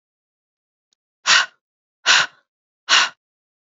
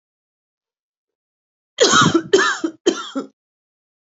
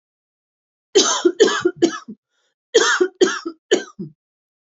{
  "exhalation_length": "3.7 s",
  "exhalation_amplitude": 29225,
  "exhalation_signal_mean_std_ratio": 0.31,
  "three_cough_length": "4.0 s",
  "three_cough_amplitude": 29425,
  "three_cough_signal_mean_std_ratio": 0.38,
  "cough_length": "4.7 s",
  "cough_amplitude": 32767,
  "cough_signal_mean_std_ratio": 0.42,
  "survey_phase": "alpha (2021-03-01 to 2021-08-12)",
  "age": "45-64",
  "gender": "Female",
  "wearing_mask": "No",
  "symptom_none": true,
  "smoker_status": "Never smoked",
  "respiratory_condition_asthma": false,
  "respiratory_condition_other": false,
  "recruitment_source": "REACT",
  "submission_delay": "1 day",
  "covid_test_result": "Negative",
  "covid_test_method": "RT-qPCR"
}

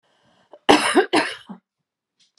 {
  "cough_length": "2.4 s",
  "cough_amplitude": 32768,
  "cough_signal_mean_std_ratio": 0.35,
  "survey_phase": "beta (2021-08-13 to 2022-03-07)",
  "age": "45-64",
  "gender": "Female",
  "wearing_mask": "No",
  "symptom_none": true,
  "smoker_status": "Never smoked",
  "respiratory_condition_asthma": true,
  "respiratory_condition_other": false,
  "recruitment_source": "REACT",
  "submission_delay": "4 days",
  "covid_test_result": "Negative",
  "covid_test_method": "RT-qPCR"
}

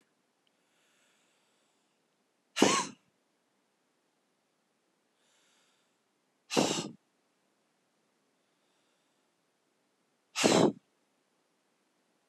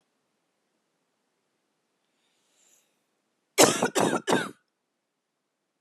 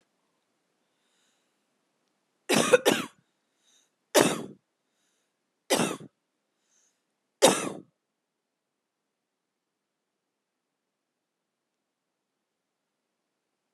{
  "exhalation_length": "12.3 s",
  "exhalation_amplitude": 13188,
  "exhalation_signal_mean_std_ratio": 0.21,
  "cough_length": "5.8 s",
  "cough_amplitude": 20448,
  "cough_signal_mean_std_ratio": 0.25,
  "three_cough_length": "13.7 s",
  "three_cough_amplitude": 23311,
  "three_cough_signal_mean_std_ratio": 0.21,
  "survey_phase": "alpha (2021-03-01 to 2021-08-12)",
  "age": "45-64",
  "gender": "Female",
  "wearing_mask": "No",
  "symptom_none": true,
  "smoker_status": "Prefer not to say",
  "respiratory_condition_asthma": true,
  "respiratory_condition_other": false,
  "recruitment_source": "REACT",
  "submission_delay": "3 days",
  "covid_test_result": "Negative",
  "covid_test_method": "RT-qPCR"
}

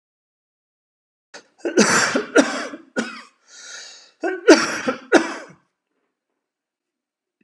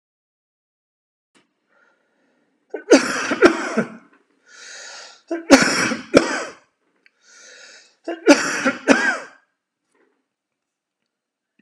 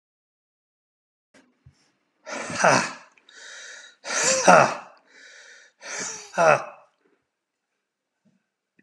{
  "cough_length": "7.4 s",
  "cough_amplitude": 32768,
  "cough_signal_mean_std_ratio": 0.34,
  "three_cough_length": "11.6 s",
  "three_cough_amplitude": 32768,
  "three_cough_signal_mean_std_ratio": 0.32,
  "exhalation_length": "8.8 s",
  "exhalation_amplitude": 30493,
  "exhalation_signal_mean_std_ratio": 0.31,
  "survey_phase": "alpha (2021-03-01 to 2021-08-12)",
  "age": "45-64",
  "gender": "Male",
  "wearing_mask": "No",
  "symptom_none": true,
  "smoker_status": "Never smoked",
  "respiratory_condition_asthma": false,
  "respiratory_condition_other": false,
  "recruitment_source": "REACT",
  "submission_delay": "1 day",
  "covid_test_result": "Negative",
  "covid_test_method": "RT-qPCR"
}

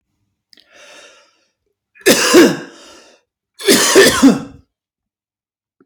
{
  "three_cough_length": "5.9 s",
  "three_cough_amplitude": 32768,
  "three_cough_signal_mean_std_ratio": 0.38,
  "survey_phase": "beta (2021-08-13 to 2022-03-07)",
  "age": "45-64",
  "gender": "Male",
  "wearing_mask": "No",
  "symptom_cough_any": true,
  "symptom_sore_throat": true,
  "smoker_status": "Never smoked",
  "respiratory_condition_asthma": true,
  "respiratory_condition_other": false,
  "recruitment_source": "REACT",
  "submission_delay": "1 day",
  "covid_test_result": "Negative",
  "covid_test_method": "RT-qPCR",
  "influenza_a_test_result": "Negative",
  "influenza_b_test_result": "Negative"
}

